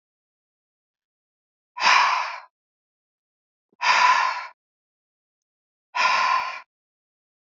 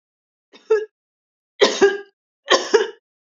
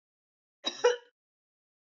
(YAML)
exhalation_length: 7.4 s
exhalation_amplitude: 19409
exhalation_signal_mean_std_ratio: 0.39
three_cough_length: 3.3 s
three_cough_amplitude: 28667
three_cough_signal_mean_std_ratio: 0.36
cough_length: 1.9 s
cough_amplitude: 7948
cough_signal_mean_std_ratio: 0.24
survey_phase: beta (2021-08-13 to 2022-03-07)
age: 65+
gender: Female
wearing_mask: 'No'
symptom_none: true
smoker_status: Never smoked
respiratory_condition_asthma: false
respiratory_condition_other: false
recruitment_source: REACT
submission_delay: 3 days
covid_test_result: Negative
covid_test_method: RT-qPCR
influenza_a_test_result: Negative
influenza_b_test_result: Negative